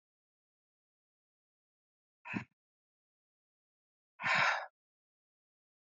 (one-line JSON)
{"exhalation_length": "5.8 s", "exhalation_amplitude": 3622, "exhalation_signal_mean_std_ratio": 0.23, "survey_phase": "beta (2021-08-13 to 2022-03-07)", "age": "65+", "gender": "Female", "wearing_mask": "No", "symptom_cough_any": true, "symptom_runny_or_blocked_nose": true, "symptom_sore_throat": true, "symptom_fatigue": true, "symptom_onset": "3 days", "smoker_status": "Ex-smoker", "respiratory_condition_asthma": false, "respiratory_condition_other": false, "recruitment_source": "Test and Trace", "submission_delay": "1 day", "covid_test_result": "Positive", "covid_test_method": "RT-qPCR", "covid_ct_value": 21.4, "covid_ct_gene": "ORF1ab gene"}